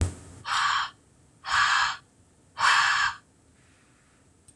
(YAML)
exhalation_length: 4.6 s
exhalation_amplitude: 12181
exhalation_signal_mean_std_ratio: 0.52
survey_phase: beta (2021-08-13 to 2022-03-07)
age: 45-64
gender: Female
wearing_mask: 'No'
symptom_none: true
smoker_status: Never smoked
respiratory_condition_asthma: false
respiratory_condition_other: false
recruitment_source: REACT
submission_delay: 1 day
covid_test_result: Negative
covid_test_method: RT-qPCR
influenza_a_test_result: Negative
influenza_b_test_result: Negative